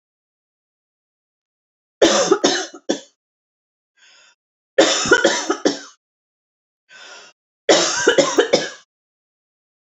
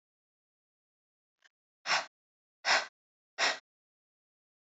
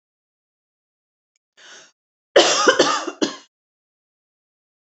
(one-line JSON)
{"three_cough_length": "9.9 s", "three_cough_amplitude": 30720, "three_cough_signal_mean_std_ratio": 0.37, "exhalation_length": "4.6 s", "exhalation_amplitude": 7086, "exhalation_signal_mean_std_ratio": 0.26, "cough_length": "4.9 s", "cough_amplitude": 28452, "cough_signal_mean_std_ratio": 0.29, "survey_phase": "alpha (2021-03-01 to 2021-08-12)", "age": "45-64", "gender": "Female", "wearing_mask": "No", "symptom_none": true, "smoker_status": "Never smoked", "respiratory_condition_asthma": false, "respiratory_condition_other": false, "recruitment_source": "REACT", "submission_delay": "2 days", "covid_test_result": "Negative", "covid_test_method": "RT-qPCR"}